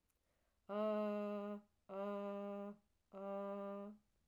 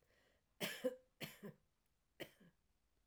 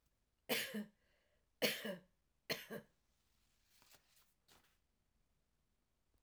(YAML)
exhalation_length: 4.3 s
exhalation_amplitude: 814
exhalation_signal_mean_std_ratio: 0.72
cough_length: 3.1 s
cough_amplitude: 1178
cough_signal_mean_std_ratio: 0.33
three_cough_length: 6.2 s
three_cough_amplitude: 3107
three_cough_signal_mean_std_ratio: 0.29
survey_phase: alpha (2021-03-01 to 2021-08-12)
age: 65+
gender: Female
wearing_mask: 'No'
symptom_cough_any: true
symptom_fatigue: true
smoker_status: Never smoked
respiratory_condition_asthma: false
respiratory_condition_other: false
recruitment_source: Test and Trace
submission_delay: 2 days
covid_test_result: Positive
covid_test_method: RT-qPCR
covid_ct_value: 28.5
covid_ct_gene: ORF1ab gene
covid_ct_mean: 29.0
covid_viral_load: 300 copies/ml
covid_viral_load_category: Minimal viral load (< 10K copies/ml)